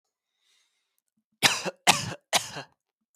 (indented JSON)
{
  "three_cough_length": "3.2 s",
  "three_cough_amplitude": 20486,
  "three_cough_signal_mean_std_ratio": 0.29,
  "survey_phase": "beta (2021-08-13 to 2022-03-07)",
  "age": "18-44",
  "gender": "Male",
  "wearing_mask": "No",
  "symptom_runny_or_blocked_nose": true,
  "smoker_status": "Current smoker (e-cigarettes or vapes only)",
  "respiratory_condition_asthma": false,
  "respiratory_condition_other": false,
  "recruitment_source": "REACT",
  "submission_delay": "1 day",
  "covid_test_result": "Negative",
  "covid_test_method": "RT-qPCR"
}